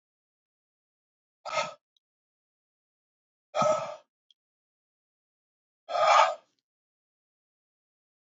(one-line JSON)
{"exhalation_length": "8.3 s", "exhalation_amplitude": 14369, "exhalation_signal_mean_std_ratio": 0.25, "survey_phase": "beta (2021-08-13 to 2022-03-07)", "age": "45-64", "gender": "Male", "wearing_mask": "No", "symptom_none": true, "smoker_status": "Never smoked", "respiratory_condition_asthma": false, "respiratory_condition_other": false, "recruitment_source": "REACT", "submission_delay": "3 days", "covid_test_result": "Negative", "covid_test_method": "RT-qPCR", "influenza_a_test_result": "Negative", "influenza_b_test_result": "Negative"}